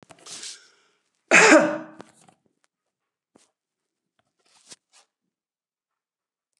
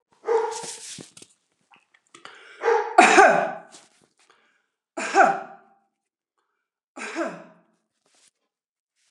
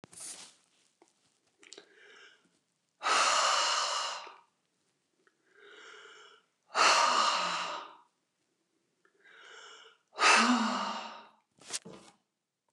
cough_length: 6.6 s
cough_amplitude: 28595
cough_signal_mean_std_ratio: 0.21
three_cough_length: 9.1 s
three_cough_amplitude: 29203
three_cough_signal_mean_std_ratio: 0.32
exhalation_length: 12.7 s
exhalation_amplitude: 11347
exhalation_signal_mean_std_ratio: 0.41
survey_phase: beta (2021-08-13 to 2022-03-07)
age: 45-64
gender: Female
wearing_mask: 'No'
symptom_runny_or_blocked_nose: true
symptom_fatigue: true
symptom_onset: 13 days
smoker_status: Never smoked
respiratory_condition_asthma: false
respiratory_condition_other: false
recruitment_source: REACT
submission_delay: 5 days
covid_test_result: Negative
covid_test_method: RT-qPCR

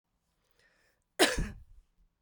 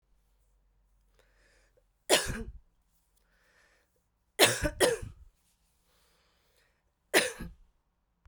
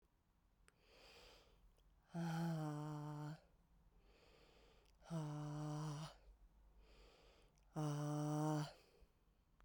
cough_length: 2.2 s
cough_amplitude: 10359
cough_signal_mean_std_ratio: 0.26
three_cough_length: 8.3 s
three_cough_amplitude: 17412
three_cough_signal_mean_std_ratio: 0.26
exhalation_length: 9.6 s
exhalation_amplitude: 937
exhalation_signal_mean_std_ratio: 0.58
survey_phase: beta (2021-08-13 to 2022-03-07)
age: 18-44
gender: Female
wearing_mask: 'No'
symptom_runny_or_blocked_nose: true
symptom_onset: 4 days
smoker_status: Ex-smoker
respiratory_condition_asthma: false
respiratory_condition_other: false
recruitment_source: Test and Trace
submission_delay: 2 days
covid_test_result: Positive
covid_test_method: RT-qPCR
covid_ct_value: 16.0
covid_ct_gene: ORF1ab gene
covid_ct_mean: 16.4
covid_viral_load: 4300000 copies/ml
covid_viral_load_category: High viral load (>1M copies/ml)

